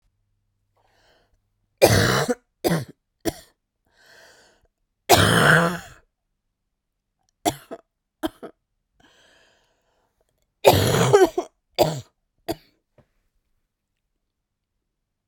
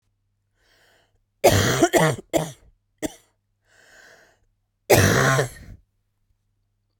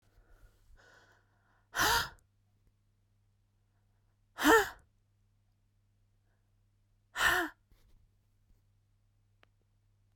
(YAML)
three_cough_length: 15.3 s
three_cough_amplitude: 32768
three_cough_signal_mean_std_ratio: 0.31
cough_length: 7.0 s
cough_amplitude: 28761
cough_signal_mean_std_ratio: 0.36
exhalation_length: 10.2 s
exhalation_amplitude: 8146
exhalation_signal_mean_std_ratio: 0.24
survey_phase: beta (2021-08-13 to 2022-03-07)
age: 45-64
gender: Female
wearing_mask: 'No'
symptom_cough_any: true
symptom_new_continuous_cough: true
symptom_sore_throat: true
symptom_fatigue: true
symptom_headache: true
symptom_change_to_sense_of_smell_or_taste: true
symptom_loss_of_taste: true
smoker_status: Never smoked
respiratory_condition_asthma: false
respiratory_condition_other: false
recruitment_source: Test and Trace
submission_delay: 3 days
covid_test_result: Positive
covid_test_method: RT-qPCR
covid_ct_value: 20.9
covid_ct_gene: ORF1ab gene
covid_ct_mean: 21.5
covid_viral_load: 87000 copies/ml
covid_viral_load_category: Low viral load (10K-1M copies/ml)